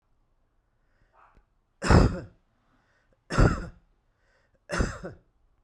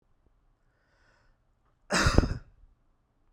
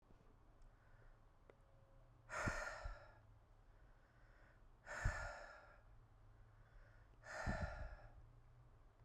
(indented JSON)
{
  "three_cough_length": "5.6 s",
  "three_cough_amplitude": 20321,
  "three_cough_signal_mean_std_ratio": 0.28,
  "cough_length": "3.3 s",
  "cough_amplitude": 24869,
  "cough_signal_mean_std_ratio": 0.26,
  "exhalation_length": "9.0 s",
  "exhalation_amplitude": 1415,
  "exhalation_signal_mean_std_ratio": 0.5,
  "survey_phase": "beta (2021-08-13 to 2022-03-07)",
  "age": "45-64",
  "gender": "Male",
  "wearing_mask": "No",
  "symptom_none": true,
  "smoker_status": "Ex-smoker",
  "respiratory_condition_asthma": false,
  "respiratory_condition_other": false,
  "recruitment_source": "REACT",
  "submission_delay": "1 day",
  "covid_test_result": "Negative",
  "covid_test_method": "RT-qPCR"
}